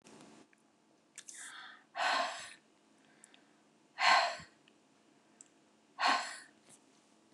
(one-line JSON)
{"exhalation_length": "7.3 s", "exhalation_amplitude": 8076, "exhalation_signal_mean_std_ratio": 0.33, "survey_phase": "beta (2021-08-13 to 2022-03-07)", "age": "45-64", "gender": "Female", "wearing_mask": "No", "symptom_none": true, "smoker_status": "Never smoked", "respiratory_condition_asthma": false, "respiratory_condition_other": false, "recruitment_source": "REACT", "submission_delay": "0 days", "covid_test_result": "Negative", "covid_test_method": "RT-qPCR", "influenza_a_test_result": "Negative", "influenza_b_test_result": "Negative"}